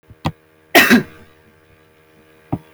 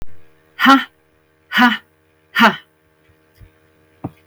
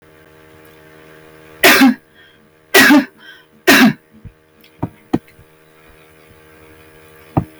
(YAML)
cough_length: 2.7 s
cough_amplitude: 32768
cough_signal_mean_std_ratio: 0.3
exhalation_length: 4.3 s
exhalation_amplitude: 32766
exhalation_signal_mean_std_ratio: 0.34
three_cough_length: 7.6 s
three_cough_amplitude: 32768
three_cough_signal_mean_std_ratio: 0.34
survey_phase: beta (2021-08-13 to 2022-03-07)
age: 45-64
gender: Female
wearing_mask: 'No'
symptom_none: true
smoker_status: Never smoked
respiratory_condition_asthma: false
respiratory_condition_other: false
recruitment_source: REACT
submission_delay: 2 days
covid_test_result: Negative
covid_test_method: RT-qPCR
influenza_a_test_result: Negative
influenza_b_test_result: Negative